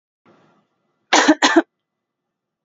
{
  "cough_length": "2.6 s",
  "cough_amplitude": 32601,
  "cough_signal_mean_std_ratio": 0.3,
  "survey_phase": "beta (2021-08-13 to 2022-03-07)",
  "age": "45-64",
  "gender": "Female",
  "wearing_mask": "Yes",
  "symptom_none": true,
  "smoker_status": "Ex-smoker",
  "respiratory_condition_asthma": false,
  "respiratory_condition_other": false,
  "recruitment_source": "REACT",
  "submission_delay": "3 days",
  "covid_test_result": "Negative",
  "covid_test_method": "RT-qPCR",
  "influenza_a_test_result": "Negative",
  "influenza_b_test_result": "Negative"
}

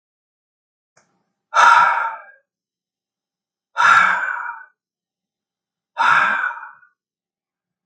{
  "exhalation_length": "7.9 s",
  "exhalation_amplitude": 32766,
  "exhalation_signal_mean_std_ratio": 0.38,
  "survey_phase": "beta (2021-08-13 to 2022-03-07)",
  "age": "45-64",
  "gender": "Male",
  "wearing_mask": "No",
  "symptom_none": true,
  "smoker_status": "Never smoked",
  "respiratory_condition_asthma": false,
  "respiratory_condition_other": false,
  "recruitment_source": "REACT",
  "submission_delay": "1 day",
  "covid_test_result": "Negative",
  "covid_test_method": "RT-qPCR",
  "influenza_a_test_result": "Negative",
  "influenza_b_test_result": "Negative"
}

